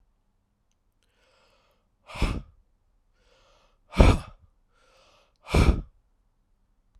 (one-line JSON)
{"exhalation_length": "7.0 s", "exhalation_amplitude": 29107, "exhalation_signal_mean_std_ratio": 0.23, "survey_phase": "alpha (2021-03-01 to 2021-08-12)", "age": "45-64", "gender": "Male", "wearing_mask": "No", "symptom_cough_any": true, "symptom_change_to_sense_of_smell_or_taste": true, "symptom_onset": "7 days", "smoker_status": "Ex-smoker", "respiratory_condition_asthma": false, "respiratory_condition_other": false, "recruitment_source": "Test and Trace", "submission_delay": "2 days", "covid_test_result": "Positive", "covid_test_method": "RT-qPCR"}